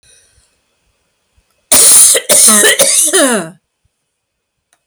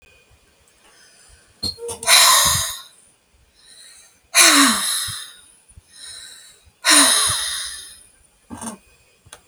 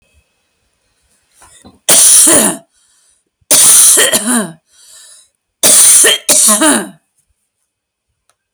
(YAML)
cough_length: 4.9 s
cough_amplitude: 32768
cough_signal_mean_std_ratio: 0.52
exhalation_length: 9.5 s
exhalation_amplitude: 32768
exhalation_signal_mean_std_ratio: 0.41
three_cough_length: 8.5 s
three_cough_amplitude: 32768
three_cough_signal_mean_std_ratio: 0.51
survey_phase: alpha (2021-03-01 to 2021-08-12)
age: 45-64
gender: Female
wearing_mask: 'No'
symptom_none: true
symptom_onset: 12 days
smoker_status: Never smoked
respiratory_condition_asthma: false
respiratory_condition_other: false
recruitment_source: REACT
submission_delay: 2 days
covid_test_result: Negative
covid_test_method: RT-qPCR